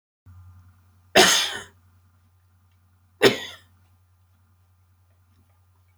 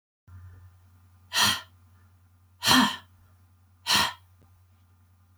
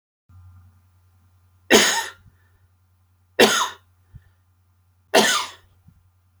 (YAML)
cough_length: 6.0 s
cough_amplitude: 29998
cough_signal_mean_std_ratio: 0.24
exhalation_length: 5.4 s
exhalation_amplitude: 17039
exhalation_signal_mean_std_ratio: 0.33
three_cough_length: 6.4 s
three_cough_amplitude: 30005
three_cough_signal_mean_std_ratio: 0.3
survey_phase: beta (2021-08-13 to 2022-03-07)
age: 65+
gender: Male
wearing_mask: 'No'
symptom_runny_or_blocked_nose: true
symptom_onset: 13 days
smoker_status: Never smoked
respiratory_condition_asthma: false
respiratory_condition_other: false
recruitment_source: REACT
submission_delay: 1 day
covid_test_result: Negative
covid_test_method: RT-qPCR
influenza_a_test_result: Negative
influenza_b_test_result: Negative